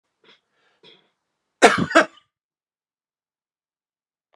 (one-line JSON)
{"cough_length": "4.4 s", "cough_amplitude": 32768, "cough_signal_mean_std_ratio": 0.19, "survey_phase": "beta (2021-08-13 to 2022-03-07)", "age": "45-64", "gender": "Male", "wearing_mask": "No", "symptom_cough_any": true, "symptom_runny_or_blocked_nose": true, "symptom_fatigue": true, "symptom_headache": true, "smoker_status": "Never smoked", "respiratory_condition_asthma": false, "respiratory_condition_other": false, "recruitment_source": "Test and Trace", "submission_delay": "2 days", "covid_test_result": "Positive", "covid_test_method": "RT-qPCR", "covid_ct_value": 22.6, "covid_ct_gene": "ORF1ab gene", "covid_ct_mean": 23.0, "covid_viral_load": "28000 copies/ml", "covid_viral_load_category": "Low viral load (10K-1M copies/ml)"}